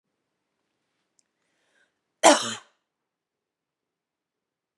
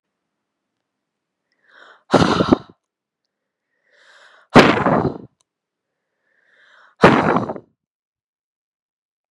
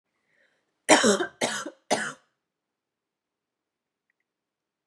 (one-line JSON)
{"cough_length": "4.8 s", "cough_amplitude": 26917, "cough_signal_mean_std_ratio": 0.16, "exhalation_length": "9.3 s", "exhalation_amplitude": 32768, "exhalation_signal_mean_std_ratio": 0.28, "three_cough_length": "4.9 s", "three_cough_amplitude": 26703, "three_cough_signal_mean_std_ratio": 0.27, "survey_phase": "beta (2021-08-13 to 2022-03-07)", "age": "18-44", "gender": "Female", "wearing_mask": "No", "symptom_cough_any": true, "symptom_new_continuous_cough": true, "symptom_runny_or_blocked_nose": true, "symptom_shortness_of_breath": true, "symptom_sore_throat": true, "symptom_fatigue": true, "symptom_fever_high_temperature": true, "symptom_headache": true, "symptom_other": true, "symptom_onset": "3 days", "smoker_status": "Never smoked", "respiratory_condition_asthma": true, "respiratory_condition_other": false, "recruitment_source": "Test and Trace", "submission_delay": "2 days", "covid_test_result": "Positive", "covid_test_method": "RT-qPCR", "covid_ct_value": 26.4, "covid_ct_gene": "ORF1ab gene"}